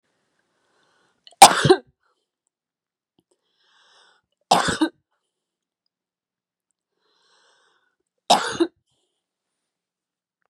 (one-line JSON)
{"three_cough_length": "10.5 s", "three_cough_amplitude": 32768, "three_cough_signal_mean_std_ratio": 0.18, "survey_phase": "beta (2021-08-13 to 2022-03-07)", "age": "18-44", "gender": "Female", "wearing_mask": "No", "symptom_none": true, "smoker_status": "Current smoker (11 or more cigarettes per day)", "respiratory_condition_asthma": true, "respiratory_condition_other": false, "recruitment_source": "REACT", "submission_delay": "1 day", "covid_test_result": "Negative", "covid_test_method": "RT-qPCR", "influenza_a_test_result": "Negative", "influenza_b_test_result": "Negative"}